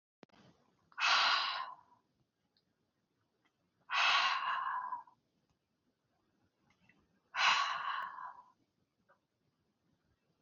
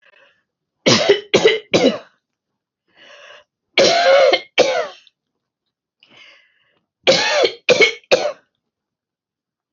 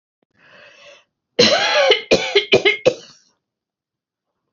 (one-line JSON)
{"exhalation_length": "10.4 s", "exhalation_amplitude": 4092, "exhalation_signal_mean_std_ratio": 0.39, "three_cough_length": "9.7 s", "three_cough_amplitude": 32768, "three_cough_signal_mean_std_ratio": 0.42, "cough_length": "4.5 s", "cough_amplitude": 31331, "cough_signal_mean_std_ratio": 0.41, "survey_phase": "beta (2021-08-13 to 2022-03-07)", "age": "65+", "gender": "Female", "wearing_mask": "No", "symptom_none": true, "smoker_status": "Never smoked", "respiratory_condition_asthma": false, "respiratory_condition_other": false, "recruitment_source": "REACT", "submission_delay": "1 day", "covid_test_result": "Negative", "covid_test_method": "RT-qPCR"}